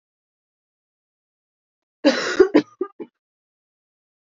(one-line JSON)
{"cough_length": "4.3 s", "cough_amplitude": 27471, "cough_signal_mean_std_ratio": 0.24, "survey_phase": "alpha (2021-03-01 to 2021-08-12)", "age": "18-44", "gender": "Female", "wearing_mask": "No", "symptom_new_continuous_cough": true, "symptom_shortness_of_breath": true, "symptom_fatigue": true, "symptom_change_to_sense_of_smell_or_taste": true, "symptom_loss_of_taste": true, "symptom_onset": "3 days", "smoker_status": "Never smoked", "respiratory_condition_asthma": false, "respiratory_condition_other": false, "recruitment_source": "Test and Trace", "submission_delay": "1 day", "covid_test_result": "Positive", "covid_test_method": "RT-qPCR", "covid_ct_value": 11.7, "covid_ct_gene": "ORF1ab gene", "covid_ct_mean": 12.0, "covid_viral_load": "120000000 copies/ml", "covid_viral_load_category": "High viral load (>1M copies/ml)"}